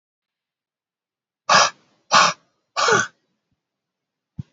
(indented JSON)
{
  "exhalation_length": "4.5 s",
  "exhalation_amplitude": 28340,
  "exhalation_signal_mean_std_ratio": 0.31,
  "survey_phase": "beta (2021-08-13 to 2022-03-07)",
  "age": "65+",
  "gender": "Male",
  "wearing_mask": "No",
  "symptom_none": true,
  "smoker_status": "Never smoked",
  "respiratory_condition_asthma": false,
  "respiratory_condition_other": false,
  "recruitment_source": "REACT",
  "submission_delay": "3 days",
  "covid_test_result": "Negative",
  "covid_test_method": "RT-qPCR",
  "influenza_a_test_result": "Negative",
  "influenza_b_test_result": "Negative"
}